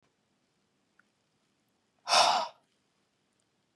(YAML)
exhalation_length: 3.8 s
exhalation_amplitude: 13108
exhalation_signal_mean_std_ratio: 0.25
survey_phase: beta (2021-08-13 to 2022-03-07)
age: 45-64
gender: Male
wearing_mask: 'No'
symptom_none: true
smoker_status: Never smoked
respiratory_condition_asthma: true
respiratory_condition_other: false
recruitment_source: REACT
submission_delay: 1 day
covid_test_result: Negative
covid_test_method: RT-qPCR